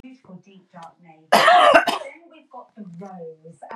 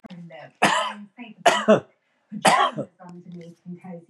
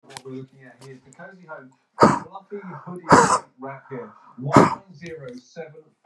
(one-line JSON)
{"cough_length": "3.8 s", "cough_amplitude": 32767, "cough_signal_mean_std_ratio": 0.38, "three_cough_length": "4.1 s", "three_cough_amplitude": 28014, "three_cough_signal_mean_std_ratio": 0.42, "exhalation_length": "6.1 s", "exhalation_amplitude": 32767, "exhalation_signal_mean_std_ratio": 0.34, "survey_phase": "beta (2021-08-13 to 2022-03-07)", "age": "45-64", "gender": "Male", "wearing_mask": "Yes", "symptom_none": true, "smoker_status": "Never smoked", "respiratory_condition_asthma": false, "respiratory_condition_other": false, "recruitment_source": "REACT", "submission_delay": "3 days", "covid_test_result": "Negative", "covid_test_method": "RT-qPCR", "influenza_a_test_result": "Negative", "influenza_b_test_result": "Negative"}